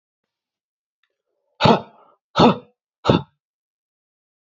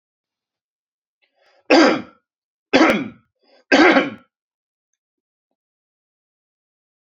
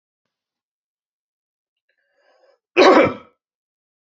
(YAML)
exhalation_length: 4.4 s
exhalation_amplitude: 28026
exhalation_signal_mean_std_ratio: 0.25
three_cough_length: 7.1 s
three_cough_amplitude: 29429
three_cough_signal_mean_std_ratio: 0.29
cough_length: 4.1 s
cough_amplitude: 29115
cough_signal_mean_std_ratio: 0.23
survey_phase: beta (2021-08-13 to 2022-03-07)
age: 18-44
gender: Male
wearing_mask: 'No'
symptom_none: true
smoker_status: Current smoker (1 to 10 cigarettes per day)
respiratory_condition_asthma: false
respiratory_condition_other: false
recruitment_source: REACT
submission_delay: 1 day
covid_test_result: Negative
covid_test_method: RT-qPCR
influenza_a_test_result: Negative
influenza_b_test_result: Negative